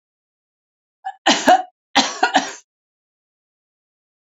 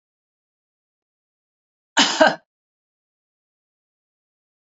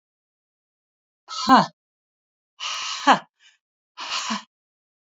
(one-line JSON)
{"three_cough_length": "4.3 s", "three_cough_amplitude": 29889, "three_cough_signal_mean_std_ratio": 0.31, "cough_length": "4.7 s", "cough_amplitude": 28552, "cough_signal_mean_std_ratio": 0.19, "exhalation_length": "5.1 s", "exhalation_amplitude": 30523, "exhalation_signal_mean_std_ratio": 0.28, "survey_phase": "beta (2021-08-13 to 2022-03-07)", "age": "65+", "gender": "Female", "wearing_mask": "No", "symptom_none": true, "smoker_status": "Never smoked", "respiratory_condition_asthma": false, "respiratory_condition_other": false, "recruitment_source": "REACT", "submission_delay": "2 days", "covid_test_result": "Negative", "covid_test_method": "RT-qPCR", "influenza_a_test_result": "Negative", "influenza_b_test_result": "Negative"}